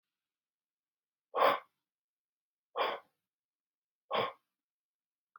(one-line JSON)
{"exhalation_length": "5.4 s", "exhalation_amplitude": 6985, "exhalation_signal_mean_std_ratio": 0.25, "survey_phase": "beta (2021-08-13 to 2022-03-07)", "age": "45-64", "gender": "Male", "wearing_mask": "No", "symptom_none": true, "symptom_onset": "12 days", "smoker_status": "Current smoker (11 or more cigarettes per day)", "respiratory_condition_asthma": false, "respiratory_condition_other": false, "recruitment_source": "REACT", "submission_delay": "2 days", "covid_test_result": "Negative", "covid_test_method": "RT-qPCR", "influenza_a_test_result": "Negative", "influenza_b_test_result": "Negative"}